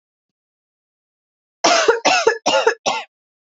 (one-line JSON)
{"cough_length": "3.6 s", "cough_amplitude": 29347, "cough_signal_mean_std_ratio": 0.43, "survey_phase": "beta (2021-08-13 to 2022-03-07)", "age": "18-44", "gender": "Female", "wearing_mask": "No", "symptom_runny_or_blocked_nose": true, "symptom_fatigue": true, "smoker_status": "Never smoked", "respiratory_condition_asthma": false, "respiratory_condition_other": false, "recruitment_source": "Test and Trace", "submission_delay": "2 days", "covid_test_result": "Positive", "covid_test_method": "ePCR"}